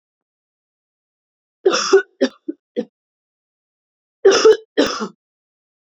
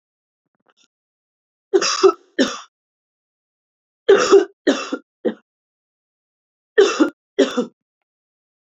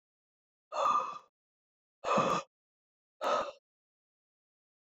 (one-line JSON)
{"cough_length": "6.0 s", "cough_amplitude": 29358, "cough_signal_mean_std_ratio": 0.3, "three_cough_length": "8.6 s", "three_cough_amplitude": 28682, "three_cough_signal_mean_std_ratio": 0.32, "exhalation_length": "4.9 s", "exhalation_amplitude": 5087, "exhalation_signal_mean_std_ratio": 0.38, "survey_phase": "beta (2021-08-13 to 2022-03-07)", "age": "18-44", "gender": "Female", "wearing_mask": "No", "symptom_cough_any": true, "symptom_runny_or_blocked_nose": true, "symptom_shortness_of_breath": true, "symptom_sore_throat": true, "symptom_abdominal_pain": true, "symptom_fatigue": true, "symptom_headache": true, "symptom_change_to_sense_of_smell_or_taste": true, "symptom_loss_of_taste": true, "symptom_onset": "3 days", "smoker_status": "Never smoked", "respiratory_condition_asthma": false, "respiratory_condition_other": false, "recruitment_source": "Test and Trace", "submission_delay": "2 days", "covid_test_result": "Positive", "covid_test_method": "RT-qPCR"}